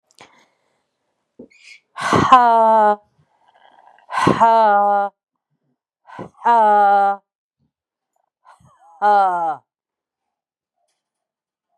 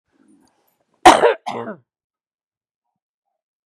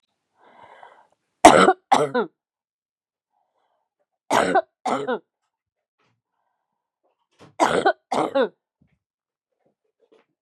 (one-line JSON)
{"exhalation_length": "11.8 s", "exhalation_amplitude": 32768, "exhalation_signal_mean_std_ratio": 0.44, "cough_length": "3.7 s", "cough_amplitude": 32768, "cough_signal_mean_std_ratio": 0.22, "three_cough_length": "10.4 s", "three_cough_amplitude": 32768, "three_cough_signal_mean_std_ratio": 0.28, "survey_phase": "beta (2021-08-13 to 2022-03-07)", "age": "45-64", "gender": "Female", "wearing_mask": "No", "symptom_cough_any": true, "symptom_sore_throat": true, "symptom_fatigue": true, "symptom_headache": true, "symptom_onset": "12 days", "smoker_status": "Ex-smoker", "respiratory_condition_asthma": false, "respiratory_condition_other": false, "recruitment_source": "REACT", "submission_delay": "2 days", "covid_test_result": "Negative", "covid_test_method": "RT-qPCR", "influenza_a_test_result": "Negative", "influenza_b_test_result": "Negative"}